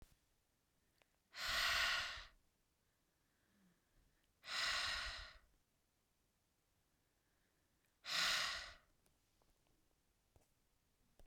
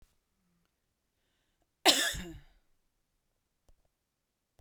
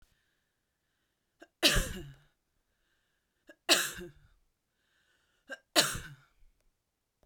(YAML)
exhalation_length: 11.3 s
exhalation_amplitude: 1567
exhalation_signal_mean_std_ratio: 0.37
cough_length: 4.6 s
cough_amplitude: 12998
cough_signal_mean_std_ratio: 0.2
three_cough_length: 7.3 s
three_cough_amplitude: 13248
three_cough_signal_mean_std_ratio: 0.25
survey_phase: beta (2021-08-13 to 2022-03-07)
age: 18-44
gender: Female
wearing_mask: 'No'
symptom_none: true
symptom_onset: 12 days
smoker_status: Ex-smoker
respiratory_condition_asthma: true
respiratory_condition_other: false
recruitment_source: REACT
submission_delay: 0 days
covid_test_result: Negative
covid_test_method: RT-qPCR